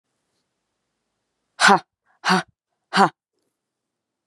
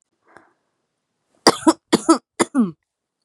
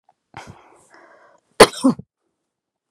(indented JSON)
{
  "exhalation_length": "4.3 s",
  "exhalation_amplitude": 31436,
  "exhalation_signal_mean_std_ratio": 0.25,
  "three_cough_length": "3.2 s",
  "three_cough_amplitude": 32768,
  "three_cough_signal_mean_std_ratio": 0.29,
  "cough_length": "2.9 s",
  "cough_amplitude": 32768,
  "cough_signal_mean_std_ratio": 0.19,
  "survey_phase": "beta (2021-08-13 to 2022-03-07)",
  "age": "18-44",
  "gender": "Female",
  "wearing_mask": "No",
  "symptom_none": true,
  "smoker_status": "Current smoker (1 to 10 cigarettes per day)",
  "respiratory_condition_asthma": false,
  "respiratory_condition_other": false,
  "recruitment_source": "REACT",
  "submission_delay": "2 days",
  "covid_test_result": "Negative",
  "covid_test_method": "RT-qPCR",
  "influenza_a_test_result": "Negative",
  "influenza_b_test_result": "Negative"
}